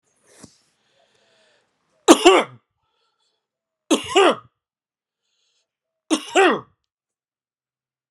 {
  "three_cough_length": "8.1 s",
  "three_cough_amplitude": 32768,
  "three_cough_signal_mean_std_ratio": 0.26,
  "survey_phase": "alpha (2021-03-01 to 2021-08-12)",
  "age": "45-64",
  "gender": "Male",
  "wearing_mask": "No",
  "symptom_cough_any": true,
  "symptom_fatigue": true,
  "symptom_headache": true,
  "symptom_change_to_sense_of_smell_or_taste": true,
  "symptom_loss_of_taste": true,
  "symptom_onset": "3 days",
  "smoker_status": "Ex-smoker",
  "respiratory_condition_asthma": false,
  "respiratory_condition_other": false,
  "recruitment_source": "Test and Trace",
  "submission_delay": "1 day",
  "covid_test_result": "Positive",
  "covid_test_method": "RT-qPCR"
}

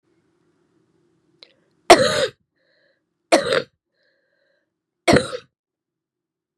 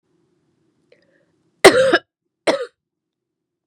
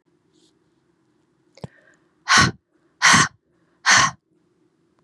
{
  "three_cough_length": "6.6 s",
  "three_cough_amplitude": 32768,
  "three_cough_signal_mean_std_ratio": 0.24,
  "cough_length": "3.7 s",
  "cough_amplitude": 32768,
  "cough_signal_mean_std_ratio": 0.26,
  "exhalation_length": "5.0 s",
  "exhalation_amplitude": 28201,
  "exhalation_signal_mean_std_ratio": 0.31,
  "survey_phase": "beta (2021-08-13 to 2022-03-07)",
  "age": "45-64",
  "gender": "Female",
  "wearing_mask": "No",
  "symptom_cough_any": true,
  "symptom_runny_or_blocked_nose": true,
  "symptom_sore_throat": true,
  "smoker_status": "Never smoked",
  "respiratory_condition_asthma": false,
  "respiratory_condition_other": false,
  "recruitment_source": "Test and Trace",
  "submission_delay": "1 day",
  "covid_test_result": "Positive",
  "covid_test_method": "LFT"
}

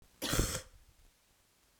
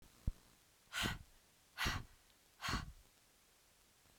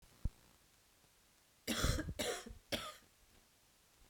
{
  "cough_length": "1.8 s",
  "cough_amplitude": 4983,
  "cough_signal_mean_std_ratio": 0.38,
  "exhalation_length": "4.2 s",
  "exhalation_amplitude": 2033,
  "exhalation_signal_mean_std_ratio": 0.39,
  "three_cough_length": "4.1 s",
  "three_cough_amplitude": 2909,
  "three_cough_signal_mean_std_ratio": 0.4,
  "survey_phase": "beta (2021-08-13 to 2022-03-07)",
  "age": "45-64",
  "gender": "Female",
  "wearing_mask": "No",
  "symptom_runny_or_blocked_nose": true,
  "symptom_shortness_of_breath": true,
  "symptom_change_to_sense_of_smell_or_taste": true,
  "smoker_status": "Never smoked",
  "respiratory_condition_asthma": false,
  "respiratory_condition_other": false,
  "recruitment_source": "Test and Trace",
  "submission_delay": "2 days",
  "covid_test_result": "Positive",
  "covid_test_method": "RT-qPCR",
  "covid_ct_value": 21.6,
  "covid_ct_gene": "N gene"
}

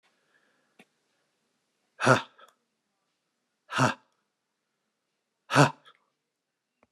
{
  "exhalation_length": "6.9 s",
  "exhalation_amplitude": 22957,
  "exhalation_signal_mean_std_ratio": 0.2,
  "survey_phase": "beta (2021-08-13 to 2022-03-07)",
  "age": "45-64",
  "gender": "Male",
  "wearing_mask": "No",
  "symptom_none": true,
  "smoker_status": "Current smoker (11 or more cigarettes per day)",
  "respiratory_condition_asthma": false,
  "respiratory_condition_other": false,
  "recruitment_source": "REACT",
  "submission_delay": "1 day",
  "covid_test_result": "Negative",
  "covid_test_method": "RT-qPCR",
  "influenza_a_test_result": "Negative",
  "influenza_b_test_result": "Negative"
}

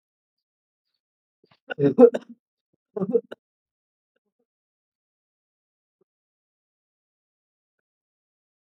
{
  "cough_length": "8.7 s",
  "cough_amplitude": 26530,
  "cough_signal_mean_std_ratio": 0.16,
  "survey_phase": "alpha (2021-03-01 to 2021-08-12)",
  "age": "18-44",
  "gender": "Male",
  "wearing_mask": "No",
  "symptom_none": true,
  "smoker_status": "Prefer not to say",
  "respiratory_condition_asthma": false,
  "respiratory_condition_other": false,
  "recruitment_source": "REACT",
  "submission_delay": "6 days",
  "covid_test_result": "Negative",
  "covid_test_method": "RT-qPCR"
}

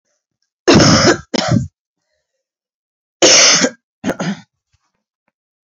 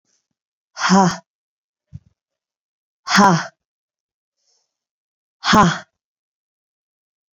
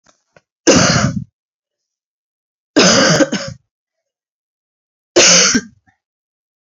{
  "cough_length": "5.7 s",
  "cough_amplitude": 32768,
  "cough_signal_mean_std_ratio": 0.41,
  "exhalation_length": "7.3 s",
  "exhalation_amplitude": 28116,
  "exhalation_signal_mean_std_ratio": 0.29,
  "three_cough_length": "6.7 s",
  "three_cough_amplitude": 32767,
  "three_cough_signal_mean_std_ratio": 0.41,
  "survey_phase": "alpha (2021-03-01 to 2021-08-12)",
  "age": "18-44",
  "gender": "Female",
  "wearing_mask": "No",
  "symptom_cough_any": true,
  "symptom_fatigue": true,
  "symptom_fever_high_temperature": true,
  "symptom_headache": true,
  "symptom_change_to_sense_of_smell_or_taste": true,
  "symptom_onset": "4 days",
  "smoker_status": "Current smoker (1 to 10 cigarettes per day)",
  "respiratory_condition_asthma": false,
  "respiratory_condition_other": false,
  "recruitment_source": "Test and Trace",
  "submission_delay": "2 days",
  "covid_test_result": "Positive",
  "covid_test_method": "RT-qPCR",
  "covid_ct_value": 17.8,
  "covid_ct_gene": "ORF1ab gene",
  "covid_ct_mean": 18.2,
  "covid_viral_load": "1100000 copies/ml",
  "covid_viral_load_category": "High viral load (>1M copies/ml)"
}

